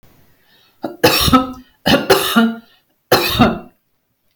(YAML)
three_cough_length: 4.4 s
three_cough_amplitude: 32768
three_cough_signal_mean_std_ratio: 0.48
survey_phase: beta (2021-08-13 to 2022-03-07)
age: 45-64
gender: Female
wearing_mask: 'No'
symptom_none: true
smoker_status: Ex-smoker
respiratory_condition_asthma: true
respiratory_condition_other: false
recruitment_source: REACT
submission_delay: 4 days
covid_test_result: Negative
covid_test_method: RT-qPCR
influenza_a_test_result: Negative
influenza_b_test_result: Negative